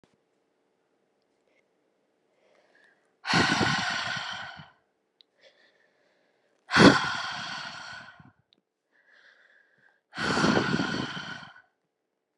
{"exhalation_length": "12.4 s", "exhalation_amplitude": 28660, "exhalation_signal_mean_std_ratio": 0.34, "survey_phase": "alpha (2021-03-01 to 2021-08-12)", "age": "18-44", "gender": "Female", "wearing_mask": "No", "symptom_cough_any": true, "symptom_shortness_of_breath": true, "symptom_fatigue": true, "symptom_fever_high_temperature": true, "symptom_headache": true, "symptom_onset": "4 days", "smoker_status": "Never smoked", "respiratory_condition_asthma": false, "respiratory_condition_other": false, "recruitment_source": "Test and Trace", "submission_delay": "2 days", "covid_test_result": "Positive", "covid_test_method": "RT-qPCR", "covid_ct_value": 17.4, "covid_ct_gene": "ORF1ab gene", "covid_ct_mean": 18.2, "covid_viral_load": "1100000 copies/ml", "covid_viral_load_category": "High viral load (>1M copies/ml)"}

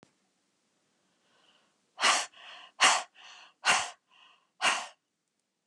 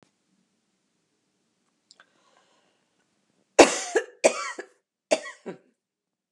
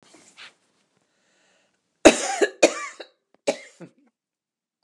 {"exhalation_length": "5.7 s", "exhalation_amplitude": 12280, "exhalation_signal_mean_std_ratio": 0.32, "three_cough_length": "6.3 s", "three_cough_amplitude": 32768, "three_cough_signal_mean_std_ratio": 0.19, "cough_length": "4.8 s", "cough_amplitude": 32767, "cough_signal_mean_std_ratio": 0.22, "survey_phase": "beta (2021-08-13 to 2022-03-07)", "age": "65+", "gender": "Female", "wearing_mask": "No", "symptom_cough_any": true, "smoker_status": "Ex-smoker", "respiratory_condition_asthma": false, "respiratory_condition_other": false, "recruitment_source": "REACT", "submission_delay": "2 days", "covid_test_result": "Negative", "covid_test_method": "RT-qPCR", "influenza_a_test_result": "Negative", "influenza_b_test_result": "Negative"}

